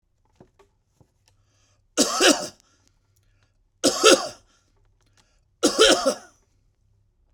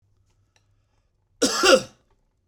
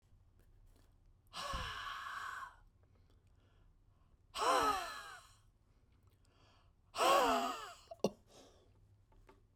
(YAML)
three_cough_length: 7.3 s
three_cough_amplitude: 29216
three_cough_signal_mean_std_ratio: 0.31
cough_length: 2.5 s
cough_amplitude: 24564
cough_signal_mean_std_ratio: 0.29
exhalation_length: 9.6 s
exhalation_amplitude: 4150
exhalation_signal_mean_std_ratio: 0.39
survey_phase: beta (2021-08-13 to 2022-03-07)
age: 45-64
gender: Male
wearing_mask: 'No'
symptom_none: true
smoker_status: Never smoked
respiratory_condition_asthma: false
respiratory_condition_other: false
recruitment_source: REACT
submission_delay: 3 days
covid_test_result: Negative
covid_test_method: RT-qPCR